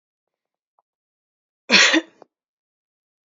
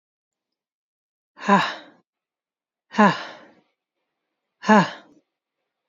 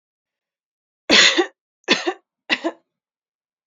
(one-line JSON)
{"cough_length": "3.2 s", "cough_amplitude": 31621, "cough_signal_mean_std_ratio": 0.24, "exhalation_length": "5.9 s", "exhalation_amplitude": 27335, "exhalation_signal_mean_std_ratio": 0.25, "three_cough_length": "3.7 s", "three_cough_amplitude": 31378, "three_cough_signal_mean_std_ratio": 0.32, "survey_phase": "beta (2021-08-13 to 2022-03-07)", "age": "18-44", "gender": "Female", "wearing_mask": "No", "symptom_abdominal_pain": true, "smoker_status": "Never smoked", "respiratory_condition_asthma": false, "respiratory_condition_other": false, "recruitment_source": "REACT", "submission_delay": "1 day", "covid_test_result": "Negative", "covid_test_method": "RT-qPCR"}